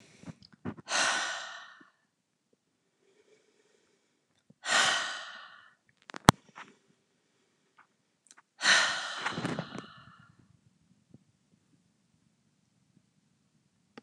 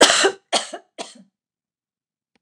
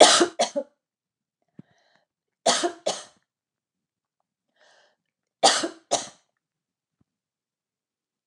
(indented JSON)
{
  "exhalation_length": "14.0 s",
  "exhalation_amplitude": 29204,
  "exhalation_signal_mean_std_ratio": 0.27,
  "cough_length": "2.4 s",
  "cough_amplitude": 29204,
  "cough_signal_mean_std_ratio": 0.32,
  "three_cough_length": "8.3 s",
  "three_cough_amplitude": 29204,
  "three_cough_signal_mean_std_ratio": 0.25,
  "survey_phase": "alpha (2021-03-01 to 2021-08-12)",
  "age": "65+",
  "gender": "Female",
  "wearing_mask": "No",
  "symptom_none": true,
  "smoker_status": "Ex-smoker",
  "respiratory_condition_asthma": false,
  "respiratory_condition_other": false,
  "recruitment_source": "REACT",
  "submission_delay": "3 days",
  "covid_test_result": "Negative",
  "covid_test_method": "RT-qPCR"
}